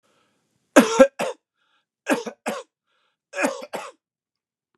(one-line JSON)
{"three_cough_length": "4.8 s", "three_cough_amplitude": 32767, "three_cough_signal_mean_std_ratio": 0.27, "survey_phase": "beta (2021-08-13 to 2022-03-07)", "age": "65+", "gender": "Male", "wearing_mask": "No", "symptom_none": true, "smoker_status": "Never smoked", "respiratory_condition_asthma": false, "respiratory_condition_other": false, "recruitment_source": "REACT", "submission_delay": "4 days", "covid_test_result": "Negative", "covid_test_method": "RT-qPCR", "influenza_a_test_result": "Negative", "influenza_b_test_result": "Negative"}